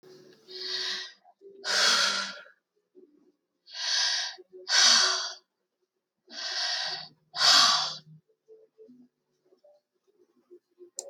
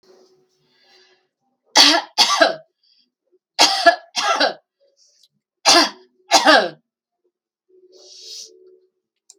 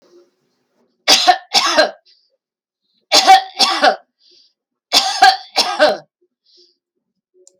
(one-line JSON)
{"exhalation_length": "11.1 s", "exhalation_amplitude": 15123, "exhalation_signal_mean_std_ratio": 0.43, "three_cough_length": "9.4 s", "three_cough_amplitude": 32768, "three_cough_signal_mean_std_ratio": 0.34, "cough_length": "7.6 s", "cough_amplitude": 32768, "cough_signal_mean_std_ratio": 0.4, "survey_phase": "beta (2021-08-13 to 2022-03-07)", "age": "65+", "gender": "Female", "wearing_mask": "No", "symptom_none": true, "smoker_status": "Never smoked", "respiratory_condition_asthma": false, "respiratory_condition_other": false, "recruitment_source": "REACT", "submission_delay": "3 days", "covid_test_result": "Negative", "covid_test_method": "RT-qPCR", "influenza_a_test_result": "Negative", "influenza_b_test_result": "Negative"}